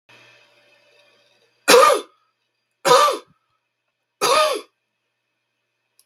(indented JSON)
{
  "three_cough_length": "6.1 s",
  "three_cough_amplitude": 32768,
  "three_cough_signal_mean_std_ratio": 0.32,
  "survey_phase": "beta (2021-08-13 to 2022-03-07)",
  "age": "65+",
  "gender": "Male",
  "wearing_mask": "No",
  "symptom_cough_any": true,
  "symptom_new_continuous_cough": true,
  "symptom_runny_or_blocked_nose": true,
  "symptom_sore_throat": true,
  "symptom_headache": true,
  "symptom_onset": "11 days",
  "smoker_status": "Never smoked",
  "respiratory_condition_asthma": false,
  "respiratory_condition_other": false,
  "recruitment_source": "REACT",
  "submission_delay": "1 day",
  "covid_test_result": "Negative",
  "covid_test_method": "RT-qPCR",
  "influenza_a_test_result": "Unknown/Void",
  "influenza_b_test_result": "Unknown/Void"
}